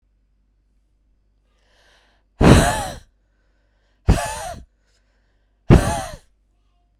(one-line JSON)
{"exhalation_length": "7.0 s", "exhalation_amplitude": 32768, "exhalation_signal_mean_std_ratio": 0.28, "survey_phase": "beta (2021-08-13 to 2022-03-07)", "age": "18-44", "gender": "Female", "wearing_mask": "No", "symptom_cough_any": true, "symptom_runny_or_blocked_nose": true, "symptom_shortness_of_breath": true, "symptom_other": true, "smoker_status": "Ex-smoker", "respiratory_condition_asthma": true, "respiratory_condition_other": false, "recruitment_source": "Test and Trace", "submission_delay": "1 day", "covid_test_result": "Positive", "covid_test_method": "ePCR"}